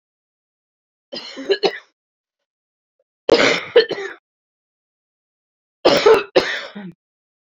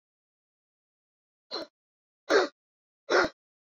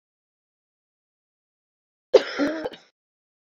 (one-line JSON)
{"three_cough_length": "7.5 s", "three_cough_amplitude": 28676, "three_cough_signal_mean_std_ratio": 0.33, "exhalation_length": "3.8 s", "exhalation_amplitude": 10690, "exhalation_signal_mean_std_ratio": 0.26, "cough_length": "3.4 s", "cough_amplitude": 26114, "cough_signal_mean_std_ratio": 0.21, "survey_phase": "beta (2021-08-13 to 2022-03-07)", "age": "45-64", "gender": "Female", "wearing_mask": "No", "symptom_new_continuous_cough": true, "symptom_runny_or_blocked_nose": true, "symptom_shortness_of_breath": true, "symptom_fatigue": true, "symptom_fever_high_temperature": true, "symptom_headache": true, "symptom_change_to_sense_of_smell_or_taste": true, "symptom_loss_of_taste": true, "symptom_onset": "8 days", "smoker_status": "Never smoked", "respiratory_condition_asthma": false, "respiratory_condition_other": false, "recruitment_source": "Test and Trace", "submission_delay": "2 days", "covid_test_result": "Positive", "covid_test_method": "RT-qPCR", "covid_ct_value": 20.4, "covid_ct_gene": "ORF1ab gene", "covid_ct_mean": 20.7, "covid_viral_load": "160000 copies/ml", "covid_viral_load_category": "Low viral load (10K-1M copies/ml)"}